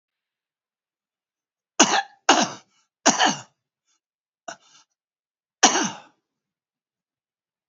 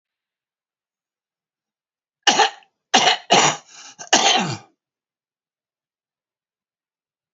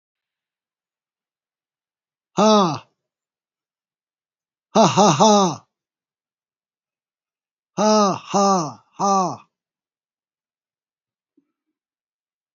{"three_cough_length": "7.7 s", "three_cough_amplitude": 32767, "three_cough_signal_mean_std_ratio": 0.26, "cough_length": "7.3 s", "cough_amplitude": 32767, "cough_signal_mean_std_ratio": 0.3, "exhalation_length": "12.5 s", "exhalation_amplitude": 28174, "exhalation_signal_mean_std_ratio": 0.33, "survey_phase": "beta (2021-08-13 to 2022-03-07)", "age": "65+", "gender": "Male", "wearing_mask": "No", "symptom_shortness_of_breath": true, "symptom_abdominal_pain": true, "symptom_fatigue": true, "symptom_other": true, "smoker_status": "Current smoker (11 or more cigarettes per day)", "respiratory_condition_asthma": false, "respiratory_condition_other": false, "recruitment_source": "REACT", "submission_delay": "1 day", "covid_test_result": "Negative", "covid_test_method": "RT-qPCR", "influenza_a_test_result": "Negative", "influenza_b_test_result": "Negative"}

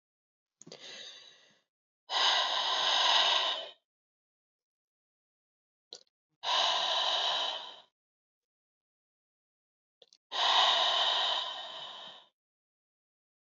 {"exhalation_length": "13.5 s", "exhalation_amplitude": 6782, "exhalation_signal_mean_std_ratio": 0.47, "survey_phase": "alpha (2021-03-01 to 2021-08-12)", "age": "45-64", "gender": "Female", "wearing_mask": "No", "symptom_cough_any": true, "symptom_onset": "4 days", "smoker_status": "Ex-smoker", "respiratory_condition_asthma": true, "respiratory_condition_other": false, "recruitment_source": "Test and Trace", "submission_delay": "1 day", "covid_test_result": "Positive", "covid_test_method": "RT-qPCR", "covid_ct_value": 16.5, "covid_ct_gene": "ORF1ab gene"}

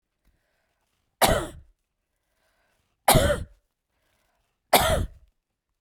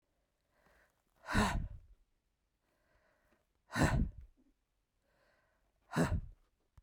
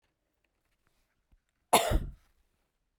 {"three_cough_length": "5.8 s", "three_cough_amplitude": 27831, "three_cough_signal_mean_std_ratio": 0.3, "exhalation_length": "6.8 s", "exhalation_amplitude": 4929, "exhalation_signal_mean_std_ratio": 0.33, "cough_length": "3.0 s", "cough_amplitude": 11393, "cough_signal_mean_std_ratio": 0.24, "survey_phase": "beta (2021-08-13 to 2022-03-07)", "age": "45-64", "gender": "Female", "wearing_mask": "No", "symptom_none": true, "smoker_status": "Never smoked", "respiratory_condition_asthma": false, "respiratory_condition_other": false, "recruitment_source": "Test and Trace", "submission_delay": "13 days", "covid_test_result": "Negative", "covid_test_method": "RT-qPCR"}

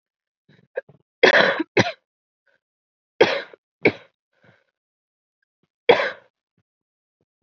{"three_cough_length": "7.4 s", "three_cough_amplitude": 28684, "three_cough_signal_mean_std_ratio": 0.26, "survey_phase": "beta (2021-08-13 to 2022-03-07)", "age": "18-44", "gender": "Female", "wearing_mask": "No", "symptom_cough_any": true, "symptom_sore_throat": true, "symptom_fatigue": true, "symptom_fever_high_temperature": true, "symptom_onset": "4 days", "smoker_status": "Never smoked", "respiratory_condition_asthma": false, "respiratory_condition_other": false, "recruitment_source": "Test and Trace", "submission_delay": "2 days", "covid_test_result": "Positive", "covid_test_method": "RT-qPCR"}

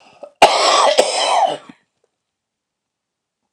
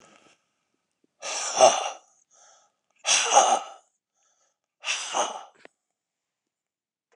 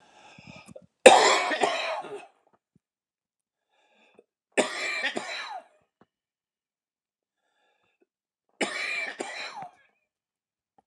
{"cough_length": "3.5 s", "cough_amplitude": 29204, "cough_signal_mean_std_ratio": 0.45, "exhalation_length": "7.2 s", "exhalation_amplitude": 22926, "exhalation_signal_mean_std_ratio": 0.32, "three_cough_length": "10.9 s", "three_cough_amplitude": 29204, "three_cough_signal_mean_std_ratio": 0.28, "survey_phase": "beta (2021-08-13 to 2022-03-07)", "age": "65+", "gender": "Male", "wearing_mask": "No", "symptom_cough_any": true, "smoker_status": "Never smoked", "respiratory_condition_asthma": false, "respiratory_condition_other": false, "recruitment_source": "REACT", "submission_delay": "3 days", "covid_test_result": "Negative", "covid_test_method": "RT-qPCR"}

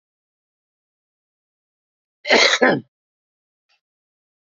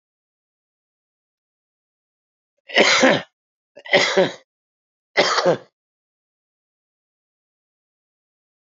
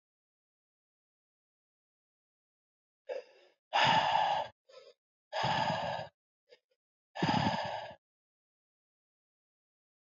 {"cough_length": "4.5 s", "cough_amplitude": 27760, "cough_signal_mean_std_ratio": 0.25, "three_cough_length": "8.6 s", "three_cough_amplitude": 28418, "three_cough_signal_mean_std_ratio": 0.29, "exhalation_length": "10.1 s", "exhalation_amplitude": 6974, "exhalation_signal_mean_std_ratio": 0.37, "survey_phase": "alpha (2021-03-01 to 2021-08-12)", "age": "45-64", "gender": "Male", "wearing_mask": "No", "symptom_cough_any": true, "smoker_status": "Ex-smoker", "respiratory_condition_asthma": false, "respiratory_condition_other": false, "recruitment_source": "REACT", "submission_delay": "0 days", "covid_test_result": "Negative", "covid_test_method": "RT-qPCR"}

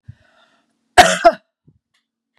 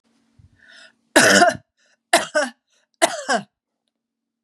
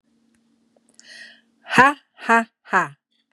{"cough_length": "2.4 s", "cough_amplitude": 32768, "cough_signal_mean_std_ratio": 0.25, "three_cough_length": "4.4 s", "three_cough_amplitude": 32767, "three_cough_signal_mean_std_ratio": 0.34, "exhalation_length": "3.3 s", "exhalation_amplitude": 32767, "exhalation_signal_mean_std_ratio": 0.29, "survey_phase": "beta (2021-08-13 to 2022-03-07)", "age": "45-64", "gender": "Female", "wearing_mask": "No", "symptom_none": true, "smoker_status": "Never smoked", "respiratory_condition_asthma": false, "respiratory_condition_other": false, "recruitment_source": "REACT", "submission_delay": "2 days", "covid_test_result": "Negative", "covid_test_method": "RT-qPCR", "influenza_a_test_result": "Negative", "influenza_b_test_result": "Negative"}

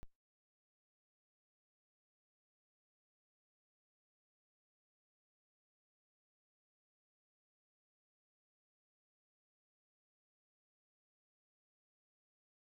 {"exhalation_length": "12.8 s", "exhalation_amplitude": 239, "exhalation_signal_mean_std_ratio": 0.06, "survey_phase": "beta (2021-08-13 to 2022-03-07)", "age": "45-64", "gender": "Female", "wearing_mask": "No", "symptom_runny_or_blocked_nose": true, "smoker_status": "Current smoker (e-cigarettes or vapes only)", "respiratory_condition_asthma": false, "respiratory_condition_other": false, "recruitment_source": "REACT", "submission_delay": "4 days", "covid_test_result": "Negative", "covid_test_method": "RT-qPCR"}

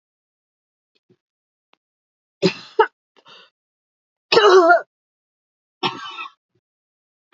{"three_cough_length": "7.3 s", "three_cough_amplitude": 32767, "three_cough_signal_mean_std_ratio": 0.26, "survey_phase": "alpha (2021-03-01 to 2021-08-12)", "age": "65+", "gender": "Female", "wearing_mask": "No", "symptom_cough_any": true, "symptom_onset": "5 days", "smoker_status": "Ex-smoker", "respiratory_condition_asthma": false, "respiratory_condition_other": false, "recruitment_source": "Test and Trace", "submission_delay": "2 days", "covid_test_result": "Positive", "covid_test_method": "RT-qPCR", "covid_ct_value": 27.4, "covid_ct_gene": "ORF1ab gene", "covid_ct_mean": 28.5, "covid_viral_load": "440 copies/ml", "covid_viral_load_category": "Minimal viral load (< 10K copies/ml)"}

